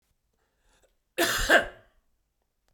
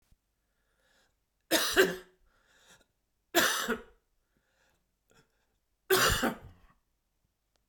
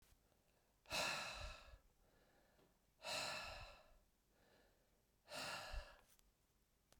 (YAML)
cough_length: 2.7 s
cough_amplitude: 16830
cough_signal_mean_std_ratio: 0.3
three_cough_length: 7.7 s
three_cough_amplitude: 11894
three_cough_signal_mean_std_ratio: 0.32
exhalation_length: 7.0 s
exhalation_amplitude: 983
exhalation_signal_mean_std_ratio: 0.47
survey_phase: beta (2021-08-13 to 2022-03-07)
age: 45-64
gender: Male
wearing_mask: 'No'
symptom_cough_any: true
symptom_new_continuous_cough: true
symptom_runny_or_blocked_nose: true
symptom_shortness_of_breath: true
symptom_sore_throat: true
symptom_fatigue: true
symptom_headache: true
symptom_change_to_sense_of_smell_or_taste: true
symptom_loss_of_taste: true
symptom_onset: 4 days
smoker_status: Ex-smoker
respiratory_condition_asthma: false
respiratory_condition_other: false
recruitment_source: Test and Trace
submission_delay: 2 days
covid_test_result: Positive
covid_test_method: ePCR